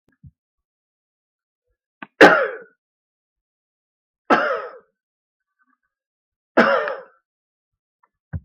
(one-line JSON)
{"three_cough_length": "8.4 s", "three_cough_amplitude": 32768, "three_cough_signal_mean_std_ratio": 0.24, "survey_phase": "beta (2021-08-13 to 2022-03-07)", "age": "65+", "gender": "Male", "wearing_mask": "No", "symptom_none": true, "smoker_status": "Never smoked", "respiratory_condition_asthma": false, "respiratory_condition_other": false, "recruitment_source": "REACT", "submission_delay": "2 days", "covid_test_result": "Negative", "covid_test_method": "RT-qPCR", "influenza_a_test_result": "Negative", "influenza_b_test_result": "Negative"}